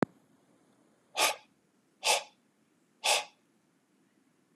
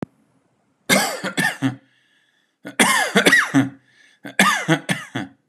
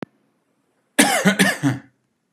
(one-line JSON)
{"exhalation_length": "4.6 s", "exhalation_amplitude": 10561, "exhalation_signal_mean_std_ratio": 0.28, "three_cough_length": "5.5 s", "three_cough_amplitude": 32751, "three_cough_signal_mean_std_ratio": 0.49, "cough_length": "2.3 s", "cough_amplitude": 32767, "cough_signal_mean_std_ratio": 0.43, "survey_phase": "beta (2021-08-13 to 2022-03-07)", "age": "18-44", "gender": "Male", "wearing_mask": "No", "symptom_none": true, "symptom_onset": "8 days", "smoker_status": "Ex-smoker", "respiratory_condition_asthma": false, "respiratory_condition_other": false, "recruitment_source": "REACT", "submission_delay": "5 days", "covid_test_result": "Negative", "covid_test_method": "RT-qPCR", "influenza_a_test_result": "Negative", "influenza_b_test_result": "Negative"}